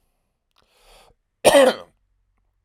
{"cough_length": "2.6 s", "cough_amplitude": 32767, "cough_signal_mean_std_ratio": 0.27, "survey_phase": "alpha (2021-03-01 to 2021-08-12)", "age": "45-64", "gender": "Male", "wearing_mask": "No", "symptom_fatigue": true, "symptom_headache": true, "symptom_onset": "6 days", "smoker_status": "Ex-smoker", "respiratory_condition_asthma": false, "respiratory_condition_other": false, "recruitment_source": "REACT", "submission_delay": "2 days", "covid_test_result": "Negative", "covid_test_method": "RT-qPCR"}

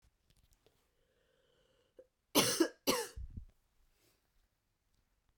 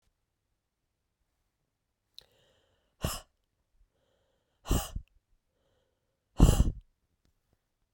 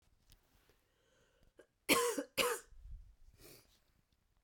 {"three_cough_length": "5.4 s", "three_cough_amplitude": 6123, "three_cough_signal_mean_std_ratio": 0.26, "exhalation_length": "7.9 s", "exhalation_amplitude": 16180, "exhalation_signal_mean_std_ratio": 0.2, "cough_length": "4.4 s", "cough_amplitude": 4834, "cough_signal_mean_std_ratio": 0.31, "survey_phase": "beta (2021-08-13 to 2022-03-07)", "age": "45-64", "gender": "Female", "wearing_mask": "No", "symptom_cough_any": true, "symptom_new_continuous_cough": true, "symptom_runny_or_blocked_nose": true, "symptom_shortness_of_breath": true, "symptom_sore_throat": true, "symptom_fatigue": true, "symptom_fever_high_temperature": true, "symptom_headache": true, "symptom_onset": "3 days", "smoker_status": "Never smoked", "respiratory_condition_asthma": false, "respiratory_condition_other": false, "recruitment_source": "Test and Trace", "submission_delay": "2 days", "covid_test_result": "Positive", "covid_test_method": "RT-qPCR", "covid_ct_value": 23.6, "covid_ct_gene": "N gene"}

